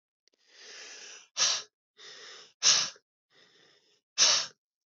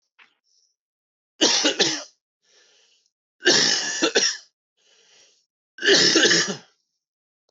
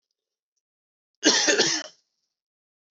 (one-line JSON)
{"exhalation_length": "4.9 s", "exhalation_amplitude": 14538, "exhalation_signal_mean_std_ratio": 0.33, "three_cough_length": "7.5 s", "three_cough_amplitude": 18319, "three_cough_signal_mean_std_ratio": 0.42, "cough_length": "2.9 s", "cough_amplitude": 18818, "cough_signal_mean_std_ratio": 0.35, "survey_phase": "beta (2021-08-13 to 2022-03-07)", "age": "18-44", "gender": "Male", "wearing_mask": "No", "symptom_cough_any": true, "symptom_runny_or_blocked_nose": true, "symptom_sore_throat": true, "symptom_fatigue": true, "symptom_fever_high_temperature": true, "symptom_headache": true, "smoker_status": "Ex-smoker", "respiratory_condition_asthma": false, "respiratory_condition_other": false, "recruitment_source": "Test and Trace", "submission_delay": "2 days", "covid_test_result": "Positive", "covid_test_method": "RT-qPCR", "covid_ct_value": 29.8, "covid_ct_gene": "ORF1ab gene"}